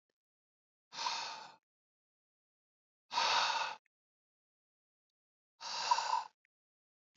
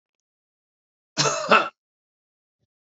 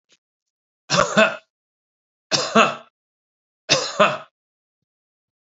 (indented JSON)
{
  "exhalation_length": "7.2 s",
  "exhalation_amplitude": 3923,
  "exhalation_signal_mean_std_ratio": 0.36,
  "cough_length": "3.0 s",
  "cough_amplitude": 28167,
  "cough_signal_mean_std_ratio": 0.27,
  "three_cough_length": "5.5 s",
  "three_cough_amplitude": 28270,
  "three_cough_signal_mean_std_ratio": 0.32,
  "survey_phase": "beta (2021-08-13 to 2022-03-07)",
  "age": "65+",
  "gender": "Male",
  "wearing_mask": "No",
  "symptom_none": true,
  "symptom_onset": "13 days",
  "smoker_status": "Never smoked",
  "respiratory_condition_asthma": false,
  "respiratory_condition_other": false,
  "recruitment_source": "REACT",
  "submission_delay": "13 days",
  "covid_test_result": "Negative",
  "covid_test_method": "RT-qPCR"
}